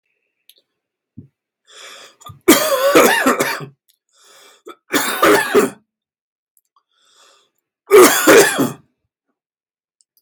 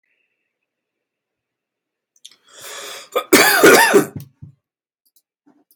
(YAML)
three_cough_length: 10.2 s
three_cough_amplitude: 32768
three_cough_signal_mean_std_ratio: 0.39
cough_length: 5.8 s
cough_amplitude: 32768
cough_signal_mean_std_ratio: 0.32
survey_phase: beta (2021-08-13 to 2022-03-07)
age: 18-44
gender: Male
wearing_mask: 'No'
symptom_cough_any: true
symptom_onset: 11 days
smoker_status: Never smoked
respiratory_condition_asthma: false
respiratory_condition_other: false
recruitment_source: REACT
submission_delay: 1 day
covid_test_result: Negative
covid_test_method: RT-qPCR